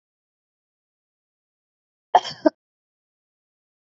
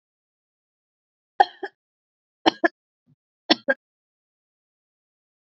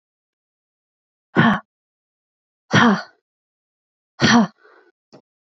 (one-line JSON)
{"cough_length": "3.9 s", "cough_amplitude": 26618, "cough_signal_mean_std_ratio": 0.12, "three_cough_length": "5.5 s", "three_cough_amplitude": 32767, "three_cough_signal_mean_std_ratio": 0.14, "exhalation_length": "5.5 s", "exhalation_amplitude": 27392, "exhalation_signal_mean_std_ratio": 0.31, "survey_phase": "beta (2021-08-13 to 2022-03-07)", "age": "18-44", "gender": "Female", "wearing_mask": "No", "symptom_none": true, "smoker_status": "Never smoked", "respiratory_condition_asthma": false, "respiratory_condition_other": false, "recruitment_source": "REACT", "submission_delay": "5 days", "covid_test_result": "Negative", "covid_test_method": "RT-qPCR", "influenza_a_test_result": "Unknown/Void", "influenza_b_test_result": "Unknown/Void"}